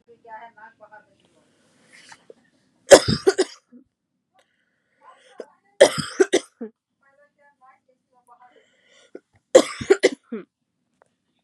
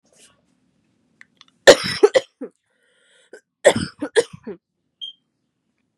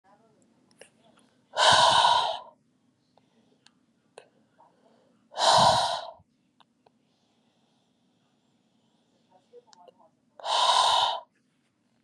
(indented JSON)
{
  "three_cough_length": "11.4 s",
  "three_cough_amplitude": 32768,
  "three_cough_signal_mean_std_ratio": 0.2,
  "cough_length": "6.0 s",
  "cough_amplitude": 32768,
  "cough_signal_mean_std_ratio": 0.22,
  "exhalation_length": "12.0 s",
  "exhalation_amplitude": 19348,
  "exhalation_signal_mean_std_ratio": 0.35,
  "survey_phase": "beta (2021-08-13 to 2022-03-07)",
  "age": "18-44",
  "gender": "Female",
  "wearing_mask": "No",
  "symptom_cough_any": true,
  "symptom_runny_or_blocked_nose": true,
  "symptom_sore_throat": true,
  "symptom_diarrhoea": true,
  "symptom_headache": true,
  "symptom_change_to_sense_of_smell_or_taste": true,
  "symptom_loss_of_taste": true,
  "symptom_onset": "6 days",
  "smoker_status": "Never smoked",
  "respiratory_condition_asthma": false,
  "respiratory_condition_other": false,
  "recruitment_source": "Test and Trace",
  "submission_delay": "2 days",
  "covid_test_result": "Positive",
  "covid_test_method": "ePCR"
}